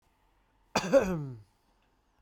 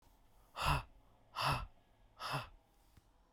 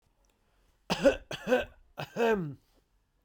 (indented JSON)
{
  "cough_length": "2.2 s",
  "cough_amplitude": 8873,
  "cough_signal_mean_std_ratio": 0.34,
  "exhalation_length": "3.3 s",
  "exhalation_amplitude": 2799,
  "exhalation_signal_mean_std_ratio": 0.42,
  "three_cough_length": "3.2 s",
  "three_cough_amplitude": 10241,
  "three_cough_signal_mean_std_ratio": 0.41,
  "survey_phase": "beta (2021-08-13 to 2022-03-07)",
  "age": "18-44",
  "gender": "Male",
  "wearing_mask": "No",
  "symptom_none": true,
  "smoker_status": "Ex-smoker",
  "respiratory_condition_asthma": false,
  "respiratory_condition_other": false,
  "recruitment_source": "REACT",
  "submission_delay": "0 days",
  "covid_test_result": "Negative",
  "covid_test_method": "RT-qPCR"
}